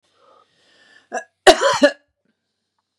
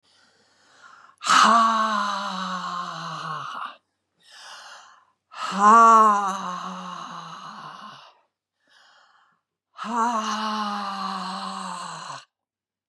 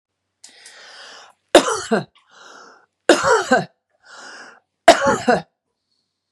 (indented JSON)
{
  "cough_length": "3.0 s",
  "cough_amplitude": 32768,
  "cough_signal_mean_std_ratio": 0.27,
  "exhalation_length": "12.9 s",
  "exhalation_amplitude": 23168,
  "exhalation_signal_mean_std_ratio": 0.46,
  "three_cough_length": "6.3 s",
  "three_cough_amplitude": 32768,
  "three_cough_signal_mean_std_ratio": 0.33,
  "survey_phase": "beta (2021-08-13 to 2022-03-07)",
  "age": "65+",
  "gender": "Female",
  "wearing_mask": "No",
  "symptom_none": true,
  "smoker_status": "Ex-smoker",
  "respiratory_condition_asthma": false,
  "respiratory_condition_other": false,
  "recruitment_source": "REACT",
  "submission_delay": "1 day",
  "covid_test_result": "Negative",
  "covid_test_method": "RT-qPCR",
  "influenza_a_test_result": "Negative",
  "influenza_b_test_result": "Negative"
}